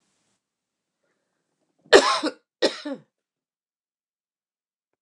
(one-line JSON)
{"cough_length": "5.0 s", "cough_amplitude": 29203, "cough_signal_mean_std_ratio": 0.21, "survey_phase": "beta (2021-08-13 to 2022-03-07)", "age": "45-64", "gender": "Female", "wearing_mask": "No", "symptom_cough_any": true, "symptom_runny_or_blocked_nose": true, "symptom_sore_throat": true, "symptom_diarrhoea": true, "symptom_fatigue": true, "symptom_headache": true, "symptom_change_to_sense_of_smell_or_taste": true, "symptom_loss_of_taste": true, "symptom_onset": "3 days", "smoker_status": "Current smoker (e-cigarettes or vapes only)", "respiratory_condition_asthma": false, "respiratory_condition_other": false, "recruitment_source": "Test and Trace", "submission_delay": "2 days", "covid_test_result": "Positive", "covid_test_method": "RT-qPCR"}